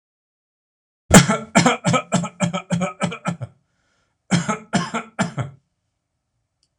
cough_length: 6.8 s
cough_amplitude: 26028
cough_signal_mean_std_ratio: 0.39
survey_phase: alpha (2021-03-01 to 2021-08-12)
age: 65+
gender: Male
wearing_mask: 'No'
symptom_none: true
smoker_status: Ex-smoker
respiratory_condition_asthma: false
respiratory_condition_other: false
recruitment_source: REACT
submission_delay: 1 day
covid_test_result: Negative
covid_test_method: RT-qPCR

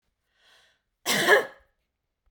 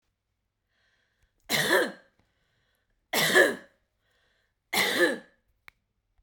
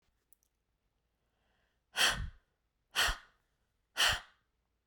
cough_length: 2.3 s
cough_amplitude: 18084
cough_signal_mean_std_ratio: 0.31
three_cough_length: 6.2 s
three_cough_amplitude: 14285
three_cough_signal_mean_std_ratio: 0.35
exhalation_length: 4.9 s
exhalation_amplitude: 5383
exhalation_signal_mean_std_ratio: 0.3
survey_phase: beta (2021-08-13 to 2022-03-07)
age: 45-64
gender: Female
wearing_mask: 'No'
symptom_none: true
smoker_status: Ex-smoker
respiratory_condition_asthma: false
respiratory_condition_other: false
recruitment_source: REACT
submission_delay: 1 day
covid_test_result: Negative
covid_test_method: RT-qPCR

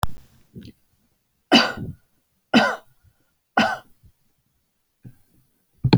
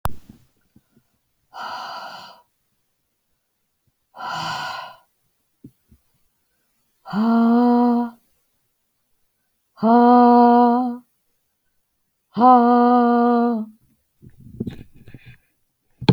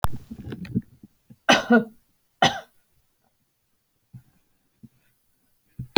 three_cough_length: 6.0 s
three_cough_amplitude: 27147
three_cough_signal_mean_std_ratio: 0.3
exhalation_length: 16.1 s
exhalation_amplitude: 25306
exhalation_signal_mean_std_ratio: 0.43
cough_length: 6.0 s
cough_amplitude: 25850
cough_signal_mean_std_ratio: 0.27
survey_phase: alpha (2021-03-01 to 2021-08-12)
age: 45-64
gender: Female
wearing_mask: 'No'
symptom_none: true
smoker_status: Never smoked
respiratory_condition_asthma: false
respiratory_condition_other: false
recruitment_source: REACT
submission_delay: 1 day
covid_test_result: Negative
covid_test_method: RT-qPCR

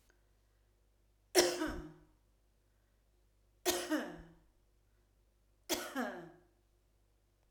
three_cough_length: 7.5 s
three_cough_amplitude: 9806
three_cough_signal_mean_std_ratio: 0.32
survey_phase: alpha (2021-03-01 to 2021-08-12)
age: 45-64
gender: Female
wearing_mask: 'No'
symptom_none: true
smoker_status: Never smoked
respiratory_condition_asthma: false
respiratory_condition_other: false
recruitment_source: REACT
submission_delay: 2 days
covid_test_result: Negative
covid_test_method: RT-qPCR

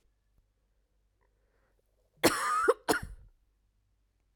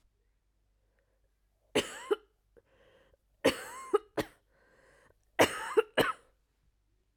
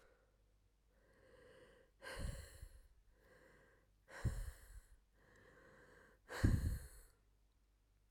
cough_length: 4.4 s
cough_amplitude: 11258
cough_signal_mean_std_ratio: 0.3
three_cough_length: 7.2 s
three_cough_amplitude: 9968
three_cough_signal_mean_std_ratio: 0.27
exhalation_length: 8.1 s
exhalation_amplitude: 3090
exhalation_signal_mean_std_ratio: 0.33
survey_phase: beta (2021-08-13 to 2022-03-07)
age: 18-44
gender: Female
wearing_mask: 'No'
symptom_cough_any: true
symptom_new_continuous_cough: true
symptom_runny_or_blocked_nose: true
symptom_shortness_of_breath: true
symptom_sore_throat: true
symptom_abdominal_pain: true
symptom_fatigue: true
symptom_headache: true
symptom_change_to_sense_of_smell_or_taste: true
symptom_loss_of_taste: true
symptom_onset: 3 days
smoker_status: Ex-smoker
respiratory_condition_asthma: true
respiratory_condition_other: false
recruitment_source: Test and Trace
submission_delay: 1 day
covid_test_result: Positive
covid_test_method: RT-qPCR
covid_ct_value: 19.5
covid_ct_gene: ORF1ab gene
covid_ct_mean: 20.3
covid_viral_load: 210000 copies/ml
covid_viral_load_category: Low viral load (10K-1M copies/ml)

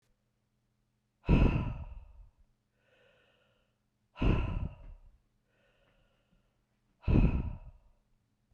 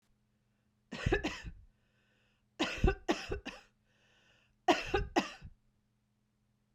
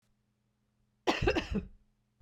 exhalation_length: 8.5 s
exhalation_amplitude: 8421
exhalation_signal_mean_std_ratio: 0.33
three_cough_length: 6.7 s
three_cough_amplitude: 6937
three_cough_signal_mean_std_ratio: 0.34
cough_length: 2.2 s
cough_amplitude: 6276
cough_signal_mean_std_ratio: 0.37
survey_phase: beta (2021-08-13 to 2022-03-07)
age: 45-64
gender: Female
wearing_mask: 'No'
symptom_none: true
smoker_status: Never smoked
respiratory_condition_asthma: false
respiratory_condition_other: false
recruitment_source: REACT
submission_delay: 1 day
covid_test_result: Negative
covid_test_method: RT-qPCR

